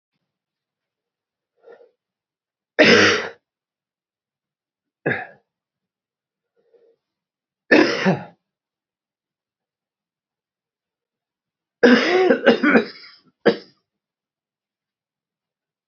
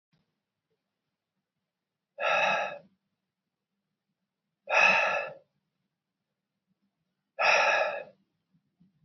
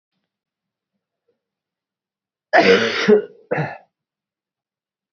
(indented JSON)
{
  "three_cough_length": "15.9 s",
  "three_cough_amplitude": 29595,
  "three_cough_signal_mean_std_ratio": 0.27,
  "exhalation_length": "9.0 s",
  "exhalation_amplitude": 10998,
  "exhalation_signal_mean_std_ratio": 0.35,
  "cough_length": "5.1 s",
  "cough_amplitude": 27437,
  "cough_signal_mean_std_ratio": 0.31,
  "survey_phase": "beta (2021-08-13 to 2022-03-07)",
  "age": "45-64",
  "gender": "Male",
  "wearing_mask": "No",
  "symptom_cough_any": true,
  "symptom_runny_or_blocked_nose": true,
  "symptom_fatigue": true,
  "symptom_onset": "3 days",
  "smoker_status": "Never smoked",
  "respiratory_condition_asthma": false,
  "respiratory_condition_other": false,
  "recruitment_source": "Test and Trace",
  "submission_delay": "2 days",
  "covid_test_result": "Positive",
  "covid_test_method": "RT-qPCR",
  "covid_ct_value": 14.6,
  "covid_ct_gene": "N gene",
  "covid_ct_mean": 14.9,
  "covid_viral_load": "13000000 copies/ml",
  "covid_viral_load_category": "High viral load (>1M copies/ml)"
}